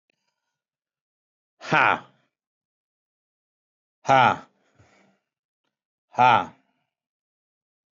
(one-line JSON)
{"exhalation_length": "7.9 s", "exhalation_amplitude": 17525, "exhalation_signal_mean_std_ratio": 0.23, "survey_phase": "beta (2021-08-13 to 2022-03-07)", "age": "45-64", "gender": "Male", "wearing_mask": "No", "symptom_none": true, "smoker_status": "Current smoker (1 to 10 cigarettes per day)", "respiratory_condition_asthma": false, "respiratory_condition_other": false, "recruitment_source": "REACT", "submission_delay": "1 day", "covid_test_result": "Negative", "covid_test_method": "RT-qPCR", "influenza_a_test_result": "Negative", "influenza_b_test_result": "Negative"}